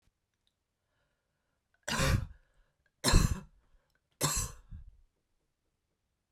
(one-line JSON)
{"three_cough_length": "6.3 s", "three_cough_amplitude": 11063, "three_cough_signal_mean_std_ratio": 0.29, "survey_phase": "beta (2021-08-13 to 2022-03-07)", "age": "45-64", "gender": "Female", "wearing_mask": "No", "symptom_none": true, "symptom_onset": "12 days", "smoker_status": "Never smoked", "respiratory_condition_asthma": false, "respiratory_condition_other": false, "recruitment_source": "REACT", "submission_delay": "2 days", "covid_test_result": "Negative", "covid_test_method": "RT-qPCR"}